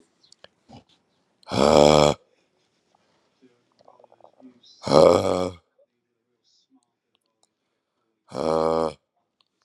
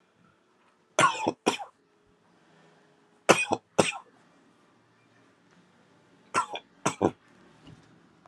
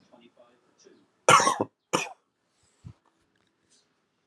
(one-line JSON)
{"exhalation_length": "9.6 s", "exhalation_amplitude": 32168, "exhalation_signal_mean_std_ratio": 0.27, "three_cough_length": "8.3 s", "three_cough_amplitude": 25690, "three_cough_signal_mean_std_ratio": 0.26, "cough_length": "4.3 s", "cough_amplitude": 20706, "cough_signal_mean_std_ratio": 0.23, "survey_phase": "alpha (2021-03-01 to 2021-08-12)", "age": "18-44", "gender": "Male", "wearing_mask": "No", "symptom_cough_any": true, "symptom_fatigue": true, "symptom_fever_high_temperature": true, "symptom_headache": true, "smoker_status": "Never smoked", "respiratory_condition_asthma": false, "respiratory_condition_other": false, "recruitment_source": "Test and Trace", "submission_delay": "2 days", "covid_test_result": "Positive", "covid_test_method": "RT-qPCR", "covid_ct_value": 19.9, "covid_ct_gene": "ORF1ab gene"}